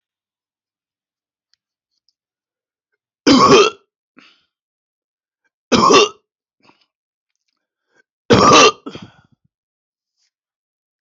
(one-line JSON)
{"three_cough_length": "11.0 s", "three_cough_amplitude": 30937, "three_cough_signal_mean_std_ratio": 0.28, "survey_phase": "alpha (2021-03-01 to 2021-08-12)", "age": "65+", "gender": "Male", "wearing_mask": "No", "symptom_none": true, "smoker_status": "Never smoked", "respiratory_condition_asthma": false, "respiratory_condition_other": false, "recruitment_source": "REACT", "submission_delay": "3 days", "covid_test_result": "Negative", "covid_test_method": "RT-qPCR"}